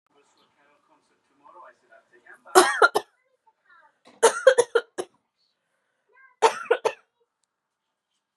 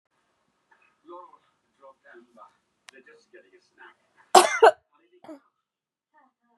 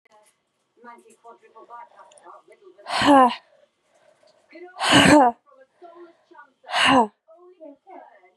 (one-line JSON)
{"three_cough_length": "8.4 s", "three_cough_amplitude": 30597, "three_cough_signal_mean_std_ratio": 0.24, "cough_length": "6.6 s", "cough_amplitude": 32475, "cough_signal_mean_std_ratio": 0.17, "exhalation_length": "8.4 s", "exhalation_amplitude": 25407, "exhalation_signal_mean_std_ratio": 0.33, "survey_phase": "beta (2021-08-13 to 2022-03-07)", "age": "18-44", "gender": "Female", "wearing_mask": "No", "symptom_runny_or_blocked_nose": true, "symptom_shortness_of_breath": true, "symptom_sore_throat": true, "symptom_abdominal_pain": true, "symptom_diarrhoea": true, "symptom_fatigue": true, "symptom_fever_high_temperature": true, "symptom_headache": true, "symptom_onset": "3 days", "smoker_status": "Current smoker (1 to 10 cigarettes per day)", "respiratory_condition_asthma": false, "respiratory_condition_other": false, "recruitment_source": "Test and Trace", "submission_delay": "2 days", "covid_test_result": "Positive", "covid_test_method": "RT-qPCR", "covid_ct_value": 18.6, "covid_ct_gene": "ORF1ab gene", "covid_ct_mean": 18.9, "covid_viral_load": "650000 copies/ml", "covid_viral_load_category": "Low viral load (10K-1M copies/ml)"}